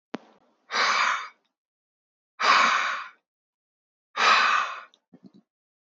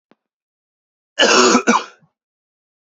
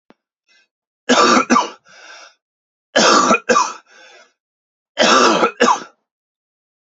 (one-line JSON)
{"exhalation_length": "5.8 s", "exhalation_amplitude": 16817, "exhalation_signal_mean_std_ratio": 0.45, "cough_length": "3.0 s", "cough_amplitude": 31408, "cough_signal_mean_std_ratio": 0.36, "three_cough_length": "6.8 s", "three_cough_amplitude": 30887, "three_cough_signal_mean_std_ratio": 0.45, "survey_phase": "beta (2021-08-13 to 2022-03-07)", "age": "45-64", "gender": "Male", "wearing_mask": "No", "symptom_cough_any": true, "symptom_new_continuous_cough": true, "symptom_sore_throat": true, "symptom_fatigue": true, "symptom_headache": true, "smoker_status": "Ex-smoker", "respiratory_condition_asthma": false, "respiratory_condition_other": false, "recruitment_source": "Test and Trace", "submission_delay": "2 days", "covid_test_result": "Positive", "covid_test_method": "RT-qPCR", "covid_ct_value": 28.1, "covid_ct_gene": "ORF1ab gene"}